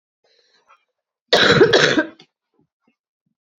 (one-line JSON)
{"cough_length": "3.6 s", "cough_amplitude": 32767, "cough_signal_mean_std_ratio": 0.35, "survey_phase": "beta (2021-08-13 to 2022-03-07)", "age": "18-44", "gender": "Female", "wearing_mask": "No", "symptom_cough_any": true, "symptom_runny_or_blocked_nose": true, "symptom_sore_throat": true, "symptom_fatigue": true, "symptom_fever_high_temperature": true, "symptom_headache": true, "symptom_change_to_sense_of_smell_or_taste": true, "symptom_loss_of_taste": true, "symptom_onset": "4 days", "smoker_status": "Never smoked", "respiratory_condition_asthma": true, "respiratory_condition_other": false, "recruitment_source": "Test and Trace", "submission_delay": "1 day", "covid_test_result": "Positive", "covid_test_method": "RT-qPCR", "covid_ct_value": 15.2, "covid_ct_gene": "N gene", "covid_ct_mean": 15.9, "covid_viral_load": "6300000 copies/ml", "covid_viral_load_category": "High viral load (>1M copies/ml)"}